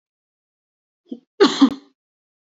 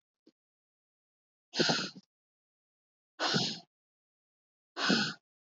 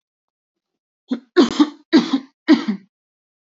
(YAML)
cough_length: 2.6 s
cough_amplitude: 26193
cough_signal_mean_std_ratio: 0.24
exhalation_length: 5.5 s
exhalation_amplitude: 6176
exhalation_signal_mean_std_ratio: 0.34
three_cough_length: 3.6 s
three_cough_amplitude: 26221
three_cough_signal_mean_std_ratio: 0.34
survey_phase: beta (2021-08-13 to 2022-03-07)
age: 18-44
gender: Female
wearing_mask: 'No'
symptom_headache: true
smoker_status: Ex-smoker
respiratory_condition_asthma: false
respiratory_condition_other: false
recruitment_source: REACT
submission_delay: 0 days
covid_test_result: Negative
covid_test_method: RT-qPCR
influenza_a_test_result: Negative
influenza_b_test_result: Negative